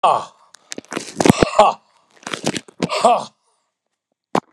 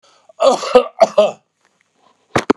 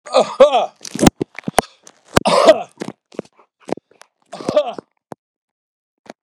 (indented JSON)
{
  "exhalation_length": "4.5 s",
  "exhalation_amplitude": 32768,
  "exhalation_signal_mean_std_ratio": 0.37,
  "cough_length": "2.6 s",
  "cough_amplitude": 32768,
  "cough_signal_mean_std_ratio": 0.39,
  "three_cough_length": "6.2 s",
  "three_cough_amplitude": 32768,
  "three_cough_signal_mean_std_ratio": 0.33,
  "survey_phase": "beta (2021-08-13 to 2022-03-07)",
  "age": "65+",
  "gender": "Male",
  "wearing_mask": "No",
  "symptom_none": true,
  "smoker_status": "Never smoked",
  "respiratory_condition_asthma": false,
  "respiratory_condition_other": false,
  "recruitment_source": "REACT",
  "submission_delay": "2 days",
  "covid_test_result": "Negative",
  "covid_test_method": "RT-qPCR"
}